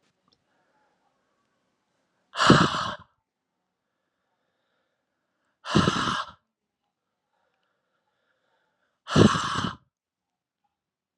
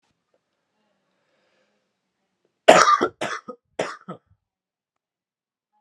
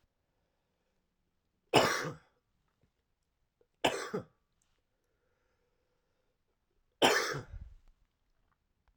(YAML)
exhalation_length: 11.2 s
exhalation_amplitude: 25356
exhalation_signal_mean_std_ratio: 0.26
cough_length: 5.8 s
cough_amplitude: 32768
cough_signal_mean_std_ratio: 0.22
three_cough_length: 9.0 s
three_cough_amplitude: 11766
three_cough_signal_mean_std_ratio: 0.25
survey_phase: alpha (2021-03-01 to 2021-08-12)
age: 18-44
gender: Male
wearing_mask: 'No'
symptom_fatigue: true
symptom_fever_high_temperature: true
symptom_headache: true
symptom_onset: 3 days
smoker_status: Never smoked
respiratory_condition_asthma: false
respiratory_condition_other: false
recruitment_source: Test and Trace
submission_delay: 1 day
covid_test_result: Positive
covid_test_method: RT-qPCR
covid_ct_value: 14.4
covid_ct_gene: ORF1ab gene
covid_ct_mean: 14.8
covid_viral_load: 14000000 copies/ml
covid_viral_load_category: High viral load (>1M copies/ml)